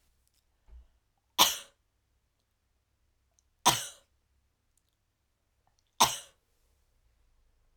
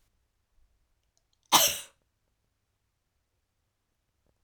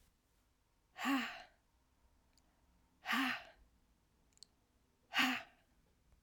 {"three_cough_length": "7.8 s", "three_cough_amplitude": 16019, "three_cough_signal_mean_std_ratio": 0.18, "cough_length": "4.4 s", "cough_amplitude": 19049, "cough_signal_mean_std_ratio": 0.17, "exhalation_length": "6.2 s", "exhalation_amplitude": 3046, "exhalation_signal_mean_std_ratio": 0.34, "survey_phase": "beta (2021-08-13 to 2022-03-07)", "age": "18-44", "gender": "Female", "wearing_mask": "No", "symptom_cough_any": true, "symptom_runny_or_blocked_nose": true, "symptom_shortness_of_breath": true, "symptom_sore_throat": true, "symptom_abdominal_pain": true, "symptom_fatigue": true, "symptom_headache": true, "symptom_onset": "5 days", "smoker_status": "Never smoked", "respiratory_condition_asthma": false, "respiratory_condition_other": false, "recruitment_source": "Test and Trace", "submission_delay": "2 days", "covid_test_result": "Positive", "covid_test_method": "RT-qPCR"}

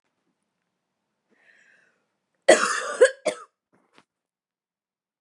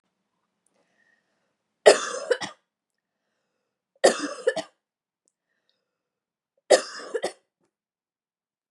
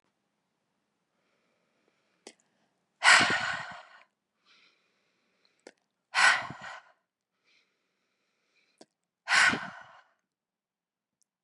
{"cough_length": "5.2 s", "cough_amplitude": 29598, "cough_signal_mean_std_ratio": 0.22, "three_cough_length": "8.7 s", "three_cough_amplitude": 30836, "three_cough_signal_mean_std_ratio": 0.21, "exhalation_length": "11.4 s", "exhalation_amplitude": 16577, "exhalation_signal_mean_std_ratio": 0.25, "survey_phase": "beta (2021-08-13 to 2022-03-07)", "age": "18-44", "gender": "Female", "wearing_mask": "No", "symptom_none": true, "symptom_onset": "12 days", "smoker_status": "Never smoked", "respiratory_condition_asthma": false, "respiratory_condition_other": false, "recruitment_source": "REACT", "submission_delay": "1 day", "covid_test_result": "Negative", "covid_test_method": "RT-qPCR", "influenza_a_test_result": "Negative", "influenza_b_test_result": "Negative"}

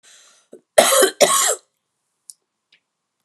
{"cough_length": "3.2 s", "cough_amplitude": 32768, "cough_signal_mean_std_ratio": 0.35, "survey_phase": "alpha (2021-03-01 to 2021-08-12)", "age": "65+", "gender": "Female", "wearing_mask": "No", "symptom_cough_any": true, "symptom_shortness_of_breath": true, "symptom_fatigue": true, "symptom_onset": "12 days", "smoker_status": "Never smoked", "respiratory_condition_asthma": false, "respiratory_condition_other": false, "recruitment_source": "REACT", "submission_delay": "1 day", "covid_test_result": "Negative", "covid_test_method": "RT-qPCR"}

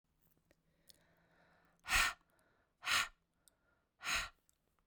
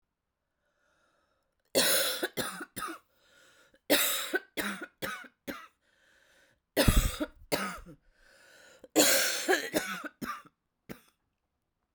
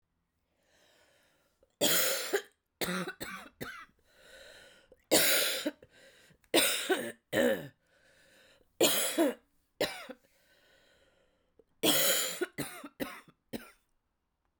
{"exhalation_length": "4.9 s", "exhalation_amplitude": 3868, "exhalation_signal_mean_std_ratio": 0.3, "cough_length": "11.9 s", "cough_amplitude": 14642, "cough_signal_mean_std_ratio": 0.4, "three_cough_length": "14.6 s", "three_cough_amplitude": 9517, "three_cough_signal_mean_std_ratio": 0.42, "survey_phase": "beta (2021-08-13 to 2022-03-07)", "age": "45-64", "gender": "Female", "wearing_mask": "No", "symptom_cough_any": true, "symptom_runny_or_blocked_nose": true, "symptom_shortness_of_breath": true, "symptom_fatigue": true, "symptom_headache": true, "symptom_change_to_sense_of_smell_or_taste": true, "symptom_loss_of_taste": true, "symptom_onset": "5 days", "smoker_status": "Ex-smoker", "respiratory_condition_asthma": false, "respiratory_condition_other": false, "recruitment_source": "Test and Trace", "submission_delay": "2 days", "covid_test_method": "RT-qPCR", "covid_ct_value": 31.4, "covid_ct_gene": "ORF1ab gene"}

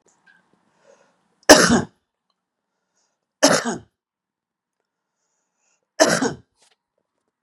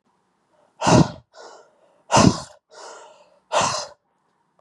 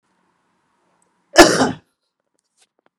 {"three_cough_length": "7.4 s", "three_cough_amplitude": 32768, "three_cough_signal_mean_std_ratio": 0.24, "exhalation_length": "4.6 s", "exhalation_amplitude": 31398, "exhalation_signal_mean_std_ratio": 0.33, "cough_length": "3.0 s", "cough_amplitude": 32768, "cough_signal_mean_std_ratio": 0.23, "survey_phase": "beta (2021-08-13 to 2022-03-07)", "age": "18-44", "gender": "Male", "wearing_mask": "No", "symptom_runny_or_blocked_nose": true, "symptom_headache": true, "symptom_onset": "3 days", "smoker_status": "Never smoked", "respiratory_condition_asthma": false, "respiratory_condition_other": false, "recruitment_source": "Test and Trace", "submission_delay": "2 days", "covid_test_result": "Positive", "covid_test_method": "RT-qPCR", "covid_ct_value": 19.7, "covid_ct_gene": "ORF1ab gene", "covid_ct_mean": 20.2, "covid_viral_load": "230000 copies/ml", "covid_viral_load_category": "Low viral load (10K-1M copies/ml)"}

